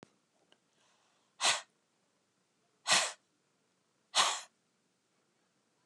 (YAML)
exhalation_length: 5.9 s
exhalation_amplitude: 6576
exhalation_signal_mean_std_ratio: 0.26
survey_phase: beta (2021-08-13 to 2022-03-07)
age: 65+
gender: Female
wearing_mask: 'No'
symptom_none: true
smoker_status: Never smoked
respiratory_condition_asthma: false
respiratory_condition_other: false
recruitment_source: REACT
submission_delay: 1 day
covid_test_result: Negative
covid_test_method: RT-qPCR